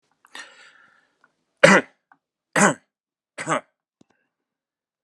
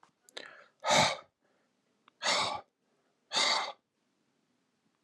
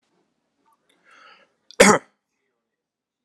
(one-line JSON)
{"three_cough_length": "5.0 s", "three_cough_amplitude": 32767, "three_cough_signal_mean_std_ratio": 0.22, "exhalation_length": "5.0 s", "exhalation_amplitude": 8522, "exhalation_signal_mean_std_ratio": 0.37, "cough_length": "3.2 s", "cough_amplitude": 32767, "cough_signal_mean_std_ratio": 0.18, "survey_phase": "alpha (2021-03-01 to 2021-08-12)", "age": "45-64", "gender": "Male", "wearing_mask": "No", "symptom_none": true, "smoker_status": "Never smoked", "respiratory_condition_asthma": false, "respiratory_condition_other": false, "recruitment_source": "REACT", "submission_delay": "6 days", "covid_test_result": "Negative", "covid_test_method": "RT-qPCR"}